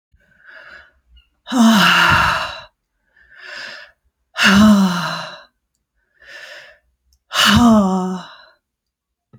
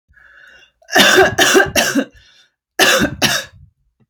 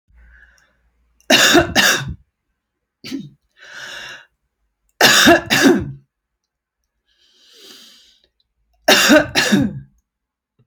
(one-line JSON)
{"exhalation_length": "9.4 s", "exhalation_amplitude": 32767, "exhalation_signal_mean_std_ratio": 0.47, "cough_length": "4.1 s", "cough_amplitude": 32768, "cough_signal_mean_std_ratio": 0.52, "three_cough_length": "10.7 s", "three_cough_amplitude": 32768, "three_cough_signal_mean_std_ratio": 0.39, "survey_phase": "alpha (2021-03-01 to 2021-08-12)", "age": "45-64", "gender": "Female", "wearing_mask": "No", "symptom_none": true, "smoker_status": "Prefer not to say", "respiratory_condition_asthma": false, "respiratory_condition_other": false, "recruitment_source": "REACT", "submission_delay": "2 days", "covid_test_result": "Negative", "covid_test_method": "RT-qPCR"}